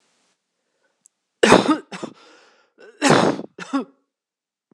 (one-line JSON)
{"cough_length": "4.7 s", "cough_amplitude": 26028, "cough_signal_mean_std_ratio": 0.32, "survey_phase": "beta (2021-08-13 to 2022-03-07)", "age": "45-64", "gender": "Female", "wearing_mask": "No", "symptom_cough_any": true, "symptom_runny_or_blocked_nose": true, "symptom_fatigue": true, "symptom_change_to_sense_of_smell_or_taste": true, "symptom_loss_of_taste": true, "symptom_other": true, "symptom_onset": "4 days", "smoker_status": "Ex-smoker", "respiratory_condition_asthma": false, "respiratory_condition_other": false, "recruitment_source": "Test and Trace", "submission_delay": "2 days", "covid_test_result": "Positive", "covid_test_method": "RT-qPCR"}